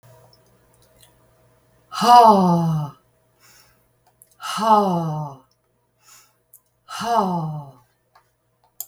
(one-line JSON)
{"exhalation_length": "8.9 s", "exhalation_amplitude": 32768, "exhalation_signal_mean_std_ratio": 0.38, "survey_phase": "beta (2021-08-13 to 2022-03-07)", "age": "65+", "gender": "Female", "wearing_mask": "No", "symptom_none": true, "smoker_status": "Ex-smoker", "respiratory_condition_asthma": false, "respiratory_condition_other": false, "recruitment_source": "REACT", "submission_delay": "2 days", "covid_test_result": "Negative", "covid_test_method": "RT-qPCR", "influenza_a_test_result": "Negative", "influenza_b_test_result": "Negative"}